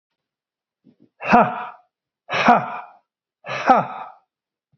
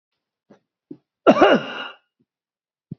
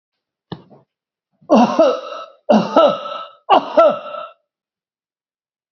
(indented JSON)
{
  "exhalation_length": "4.8 s",
  "exhalation_amplitude": 28129,
  "exhalation_signal_mean_std_ratio": 0.34,
  "cough_length": "3.0 s",
  "cough_amplitude": 28263,
  "cough_signal_mean_std_ratio": 0.28,
  "three_cough_length": "5.7 s",
  "three_cough_amplitude": 29616,
  "three_cough_signal_mean_std_ratio": 0.41,
  "survey_phase": "beta (2021-08-13 to 2022-03-07)",
  "age": "65+",
  "gender": "Male",
  "wearing_mask": "No",
  "symptom_none": true,
  "smoker_status": "Never smoked",
  "respiratory_condition_asthma": false,
  "respiratory_condition_other": false,
  "recruitment_source": "REACT",
  "submission_delay": "4 days",
  "covid_test_result": "Negative",
  "covid_test_method": "RT-qPCR"
}